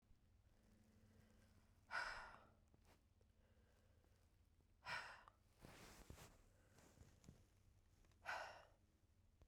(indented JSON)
{
  "exhalation_length": "9.5 s",
  "exhalation_amplitude": 542,
  "exhalation_signal_mean_std_ratio": 0.45,
  "survey_phase": "beta (2021-08-13 to 2022-03-07)",
  "age": "45-64",
  "gender": "Female",
  "wearing_mask": "No",
  "symptom_cough_any": true,
  "symptom_runny_or_blocked_nose": true,
  "symptom_abdominal_pain": true,
  "symptom_fatigue": true,
  "symptom_fever_high_temperature": true,
  "symptom_headache": true,
  "symptom_change_to_sense_of_smell_or_taste": true,
  "symptom_loss_of_taste": true,
  "smoker_status": "Never smoked",
  "respiratory_condition_asthma": false,
  "respiratory_condition_other": false,
  "recruitment_source": "Test and Trace",
  "submission_delay": "1 day",
  "covid_test_result": "Positive",
  "covid_test_method": "RT-qPCR",
  "covid_ct_value": 19.2,
  "covid_ct_gene": "N gene"
}